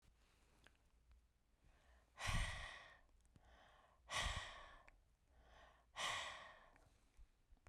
{
  "exhalation_length": "7.7 s",
  "exhalation_amplitude": 1004,
  "exhalation_signal_mean_std_ratio": 0.42,
  "survey_phase": "beta (2021-08-13 to 2022-03-07)",
  "age": "45-64",
  "gender": "Female",
  "wearing_mask": "No",
  "symptom_none": true,
  "smoker_status": "Never smoked",
  "respiratory_condition_asthma": true,
  "respiratory_condition_other": false,
  "recruitment_source": "REACT",
  "submission_delay": "2 days",
  "covid_test_result": "Negative",
  "covid_test_method": "RT-qPCR"
}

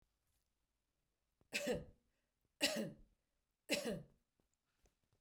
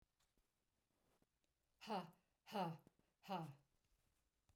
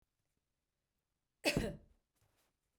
{
  "three_cough_length": "5.2 s",
  "three_cough_amplitude": 3078,
  "three_cough_signal_mean_std_ratio": 0.33,
  "exhalation_length": "4.6 s",
  "exhalation_amplitude": 642,
  "exhalation_signal_mean_std_ratio": 0.34,
  "cough_length": "2.8 s",
  "cough_amplitude": 3675,
  "cough_signal_mean_std_ratio": 0.24,
  "survey_phase": "beta (2021-08-13 to 2022-03-07)",
  "age": "45-64",
  "gender": "Female",
  "wearing_mask": "No",
  "symptom_fatigue": true,
  "symptom_headache": true,
  "symptom_onset": "12 days",
  "smoker_status": "Never smoked",
  "respiratory_condition_asthma": false,
  "respiratory_condition_other": false,
  "recruitment_source": "REACT",
  "submission_delay": "1 day",
  "covid_test_result": "Negative",
  "covid_test_method": "RT-qPCR",
  "influenza_a_test_result": "Negative",
  "influenza_b_test_result": "Negative"
}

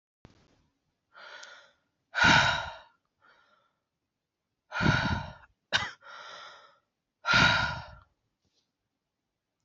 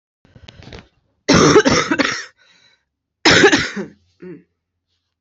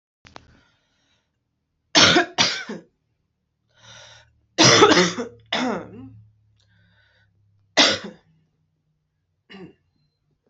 {
  "exhalation_length": "9.6 s",
  "exhalation_amplitude": 12215,
  "exhalation_signal_mean_std_ratio": 0.34,
  "cough_length": "5.2 s",
  "cough_amplitude": 31946,
  "cough_signal_mean_std_ratio": 0.41,
  "three_cough_length": "10.5 s",
  "three_cough_amplitude": 30768,
  "three_cough_signal_mean_std_ratio": 0.31,
  "survey_phase": "beta (2021-08-13 to 2022-03-07)",
  "age": "18-44",
  "gender": "Female",
  "wearing_mask": "No",
  "symptom_cough_any": true,
  "symptom_runny_or_blocked_nose": true,
  "symptom_diarrhoea": true,
  "symptom_fatigue": true,
  "symptom_headache": true,
  "symptom_onset": "4 days",
  "smoker_status": "Never smoked",
  "respiratory_condition_asthma": false,
  "respiratory_condition_other": false,
  "recruitment_source": "Test and Trace",
  "submission_delay": "1 day",
  "covid_test_result": "Positive",
  "covid_test_method": "RT-qPCR",
  "covid_ct_value": 19.0,
  "covid_ct_gene": "ORF1ab gene"
}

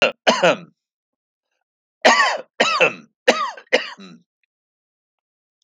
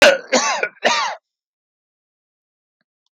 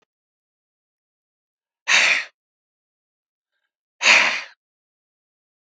{
  "three_cough_length": "5.6 s",
  "three_cough_amplitude": 32277,
  "three_cough_signal_mean_std_ratio": 0.37,
  "cough_length": "3.2 s",
  "cough_amplitude": 31651,
  "cough_signal_mean_std_ratio": 0.36,
  "exhalation_length": "5.7 s",
  "exhalation_amplitude": 31019,
  "exhalation_signal_mean_std_ratio": 0.27,
  "survey_phase": "beta (2021-08-13 to 2022-03-07)",
  "age": "45-64",
  "gender": "Male",
  "wearing_mask": "No",
  "symptom_none": true,
  "smoker_status": "Never smoked",
  "respiratory_condition_asthma": false,
  "respiratory_condition_other": false,
  "recruitment_source": "REACT",
  "submission_delay": "3 days",
  "covid_test_result": "Negative",
  "covid_test_method": "RT-qPCR",
  "influenza_a_test_result": "Unknown/Void",
  "influenza_b_test_result": "Unknown/Void"
}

